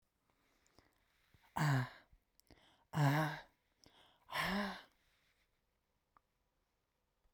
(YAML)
exhalation_length: 7.3 s
exhalation_amplitude: 3221
exhalation_signal_mean_std_ratio: 0.34
survey_phase: beta (2021-08-13 to 2022-03-07)
age: 65+
gender: Female
wearing_mask: 'No'
symptom_none: true
smoker_status: Never smoked
respiratory_condition_asthma: false
respiratory_condition_other: false
recruitment_source: REACT
submission_delay: 1 day
covid_test_result: Negative
covid_test_method: RT-qPCR